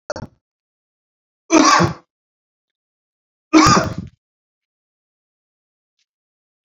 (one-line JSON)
{"three_cough_length": "6.7 s", "three_cough_amplitude": 29869, "three_cough_signal_mean_std_ratio": 0.28, "survey_phase": "beta (2021-08-13 to 2022-03-07)", "age": "45-64", "gender": "Male", "wearing_mask": "No", "symptom_none": true, "smoker_status": "Never smoked", "respiratory_condition_asthma": false, "respiratory_condition_other": false, "recruitment_source": "REACT", "submission_delay": "1 day", "covid_test_result": "Negative", "covid_test_method": "RT-qPCR"}